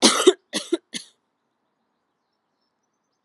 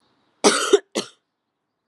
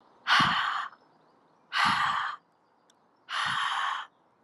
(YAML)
three_cough_length: 3.2 s
three_cough_amplitude: 32022
three_cough_signal_mean_std_ratio: 0.25
cough_length: 1.9 s
cough_amplitude: 32553
cough_signal_mean_std_ratio: 0.32
exhalation_length: 4.4 s
exhalation_amplitude: 9410
exhalation_signal_mean_std_ratio: 0.57
survey_phase: alpha (2021-03-01 to 2021-08-12)
age: 18-44
gender: Female
wearing_mask: 'No'
symptom_cough_any: true
symptom_headache: true
symptom_onset: 3 days
smoker_status: Never smoked
respiratory_condition_asthma: false
respiratory_condition_other: false
recruitment_source: Test and Trace
submission_delay: 2 days
covid_test_result: Positive
covid_test_method: RT-qPCR